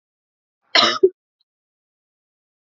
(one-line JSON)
{"cough_length": "2.6 s", "cough_amplitude": 30513, "cough_signal_mean_std_ratio": 0.24, "survey_phase": "beta (2021-08-13 to 2022-03-07)", "age": "18-44", "gender": "Female", "wearing_mask": "No", "symptom_cough_any": true, "symptom_new_continuous_cough": true, "symptom_runny_or_blocked_nose": true, "smoker_status": "Never smoked", "respiratory_condition_asthma": false, "respiratory_condition_other": false, "recruitment_source": "Test and Trace", "submission_delay": "2 days", "covid_test_result": "Positive", "covid_test_method": "RT-qPCR", "covid_ct_value": 23.0, "covid_ct_gene": "N gene"}